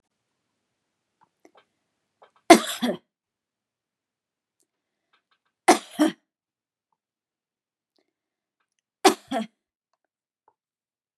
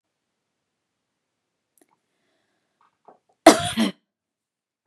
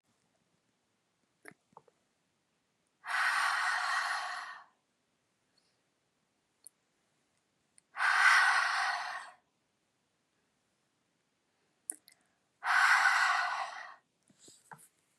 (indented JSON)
{
  "three_cough_length": "11.2 s",
  "three_cough_amplitude": 32767,
  "three_cough_signal_mean_std_ratio": 0.16,
  "cough_length": "4.9 s",
  "cough_amplitude": 32768,
  "cough_signal_mean_std_ratio": 0.16,
  "exhalation_length": "15.2 s",
  "exhalation_amplitude": 6698,
  "exhalation_signal_mean_std_ratio": 0.39,
  "survey_phase": "beta (2021-08-13 to 2022-03-07)",
  "age": "45-64",
  "gender": "Female",
  "wearing_mask": "No",
  "symptom_none": true,
  "smoker_status": "Never smoked",
  "respiratory_condition_asthma": false,
  "respiratory_condition_other": false,
  "recruitment_source": "REACT",
  "submission_delay": "2 days",
  "covid_test_result": "Negative",
  "covid_test_method": "RT-qPCR",
  "influenza_a_test_result": "Negative",
  "influenza_b_test_result": "Negative"
}